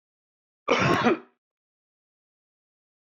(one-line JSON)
{"cough_length": "3.1 s", "cough_amplitude": 13753, "cough_signal_mean_std_ratio": 0.32, "survey_phase": "beta (2021-08-13 to 2022-03-07)", "age": "45-64", "gender": "Male", "wearing_mask": "No", "symptom_cough_any": true, "symptom_shortness_of_breath": true, "symptom_sore_throat": true, "symptom_abdominal_pain": true, "symptom_headache": true, "symptom_change_to_sense_of_smell_or_taste": true, "symptom_other": true, "symptom_onset": "9 days", "smoker_status": "Ex-smoker", "respiratory_condition_asthma": true, "respiratory_condition_other": false, "recruitment_source": "REACT", "submission_delay": "2 days", "covid_test_result": "Negative", "covid_test_method": "RT-qPCR", "influenza_a_test_result": "Negative", "influenza_b_test_result": "Negative"}